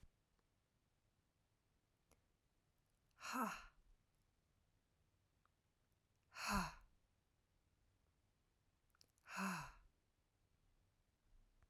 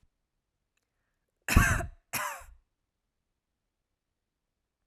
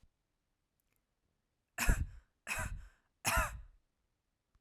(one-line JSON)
{"exhalation_length": "11.7 s", "exhalation_amplitude": 1108, "exhalation_signal_mean_std_ratio": 0.27, "cough_length": "4.9 s", "cough_amplitude": 17646, "cough_signal_mean_std_ratio": 0.23, "three_cough_length": "4.6 s", "three_cough_amplitude": 5050, "three_cough_signal_mean_std_ratio": 0.33, "survey_phase": "alpha (2021-03-01 to 2021-08-12)", "age": "18-44", "gender": "Female", "wearing_mask": "No", "symptom_none": true, "smoker_status": "Never smoked", "respiratory_condition_asthma": false, "respiratory_condition_other": false, "recruitment_source": "REACT", "submission_delay": "0 days", "covid_test_result": "Negative", "covid_test_method": "RT-qPCR"}